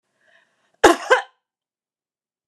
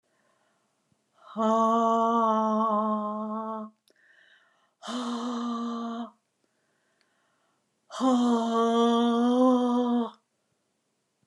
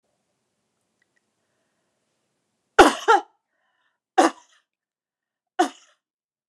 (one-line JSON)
{"cough_length": "2.5 s", "cough_amplitude": 29204, "cough_signal_mean_std_ratio": 0.23, "exhalation_length": "11.3 s", "exhalation_amplitude": 8205, "exhalation_signal_mean_std_ratio": 0.62, "three_cough_length": "6.5 s", "three_cough_amplitude": 29204, "three_cough_signal_mean_std_ratio": 0.2, "survey_phase": "beta (2021-08-13 to 2022-03-07)", "age": "65+", "gender": "Female", "wearing_mask": "No", "symptom_none": true, "smoker_status": "Never smoked", "respiratory_condition_asthma": true, "respiratory_condition_other": false, "recruitment_source": "REACT", "submission_delay": "1 day", "covid_test_result": "Negative", "covid_test_method": "RT-qPCR"}